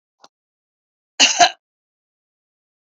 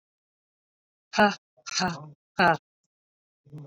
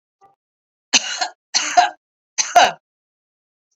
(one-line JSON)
{"cough_length": "2.8 s", "cough_amplitude": 29562, "cough_signal_mean_std_ratio": 0.23, "exhalation_length": "3.7 s", "exhalation_amplitude": 13575, "exhalation_signal_mean_std_ratio": 0.31, "three_cough_length": "3.8 s", "three_cough_amplitude": 31059, "three_cough_signal_mean_std_ratio": 0.33, "survey_phase": "beta (2021-08-13 to 2022-03-07)", "age": "45-64", "gender": "Female", "wearing_mask": "No", "symptom_cough_any": true, "symptom_runny_or_blocked_nose": true, "symptom_change_to_sense_of_smell_or_taste": true, "symptom_loss_of_taste": true, "symptom_onset": "10 days", "smoker_status": "Ex-smoker", "respiratory_condition_asthma": false, "respiratory_condition_other": false, "recruitment_source": "Test and Trace", "submission_delay": "2 days", "covid_test_result": "Positive", "covid_test_method": "RT-qPCR", "covid_ct_value": 25.0, "covid_ct_gene": "ORF1ab gene"}